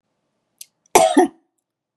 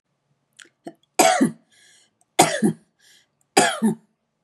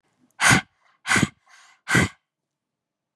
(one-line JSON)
{"cough_length": "2.0 s", "cough_amplitude": 32767, "cough_signal_mean_std_ratio": 0.3, "three_cough_length": "4.4 s", "three_cough_amplitude": 32767, "three_cough_signal_mean_std_ratio": 0.36, "exhalation_length": "3.2 s", "exhalation_amplitude": 25582, "exhalation_signal_mean_std_ratio": 0.33, "survey_phase": "beta (2021-08-13 to 2022-03-07)", "age": "45-64", "gender": "Female", "wearing_mask": "No", "symptom_none": true, "smoker_status": "Ex-smoker", "respiratory_condition_asthma": false, "respiratory_condition_other": false, "recruitment_source": "REACT", "submission_delay": "2 days", "covid_test_result": "Negative", "covid_test_method": "RT-qPCR", "influenza_a_test_result": "Negative", "influenza_b_test_result": "Negative"}